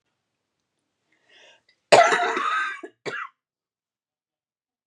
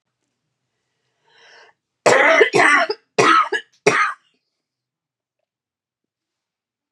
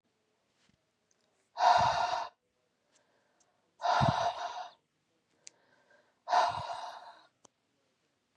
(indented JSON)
{
  "cough_length": "4.9 s",
  "cough_amplitude": 32760,
  "cough_signal_mean_std_ratio": 0.29,
  "three_cough_length": "6.9 s",
  "three_cough_amplitude": 32767,
  "three_cough_signal_mean_std_ratio": 0.36,
  "exhalation_length": "8.4 s",
  "exhalation_amplitude": 9186,
  "exhalation_signal_mean_std_ratio": 0.37,
  "survey_phase": "beta (2021-08-13 to 2022-03-07)",
  "age": "18-44",
  "gender": "Female",
  "wearing_mask": "No",
  "symptom_cough_any": true,
  "symptom_runny_or_blocked_nose": true,
  "symptom_fatigue": true,
  "symptom_headache": true,
  "symptom_change_to_sense_of_smell_or_taste": true,
  "symptom_loss_of_taste": true,
  "symptom_onset": "3 days",
  "smoker_status": "Never smoked",
  "respiratory_condition_asthma": false,
  "respiratory_condition_other": false,
  "recruitment_source": "Test and Trace",
  "submission_delay": "2 days",
  "covid_test_result": "Positive",
  "covid_test_method": "RT-qPCR"
}